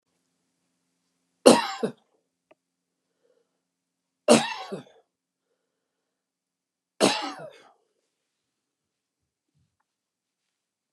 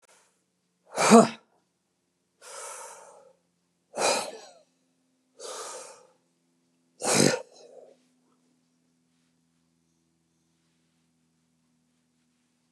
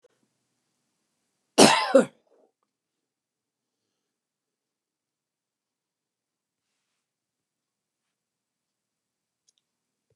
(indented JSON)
{
  "three_cough_length": "10.9 s",
  "three_cough_amplitude": 32341,
  "three_cough_signal_mean_std_ratio": 0.18,
  "exhalation_length": "12.7 s",
  "exhalation_amplitude": 27616,
  "exhalation_signal_mean_std_ratio": 0.21,
  "cough_length": "10.2 s",
  "cough_amplitude": 29680,
  "cough_signal_mean_std_ratio": 0.14,
  "survey_phase": "beta (2021-08-13 to 2022-03-07)",
  "age": "65+",
  "gender": "Male",
  "wearing_mask": "No",
  "symptom_none": true,
  "smoker_status": "Ex-smoker",
  "respiratory_condition_asthma": false,
  "respiratory_condition_other": false,
  "recruitment_source": "REACT",
  "submission_delay": "2 days",
  "covid_test_result": "Negative",
  "covid_test_method": "RT-qPCR",
  "influenza_a_test_result": "Negative",
  "influenza_b_test_result": "Negative"
}